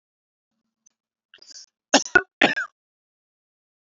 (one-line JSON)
{"cough_length": "3.8 s", "cough_amplitude": 29312, "cough_signal_mean_std_ratio": 0.2, "survey_phase": "beta (2021-08-13 to 2022-03-07)", "age": "45-64", "gender": "Female", "wearing_mask": "No", "symptom_none": true, "smoker_status": "Ex-smoker", "respiratory_condition_asthma": false, "respiratory_condition_other": false, "recruitment_source": "REACT", "submission_delay": "2 days", "covid_test_result": "Negative", "covid_test_method": "RT-qPCR", "influenza_a_test_result": "Negative", "influenza_b_test_result": "Negative"}